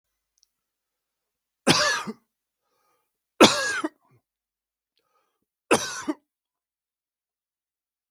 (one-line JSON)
{"three_cough_length": "8.1 s", "three_cough_amplitude": 32768, "three_cough_signal_mean_std_ratio": 0.24, "survey_phase": "beta (2021-08-13 to 2022-03-07)", "age": "45-64", "gender": "Male", "wearing_mask": "No", "symptom_none": true, "smoker_status": "Never smoked", "respiratory_condition_asthma": false, "respiratory_condition_other": false, "recruitment_source": "REACT", "submission_delay": "1 day", "covid_test_result": "Negative", "covid_test_method": "RT-qPCR"}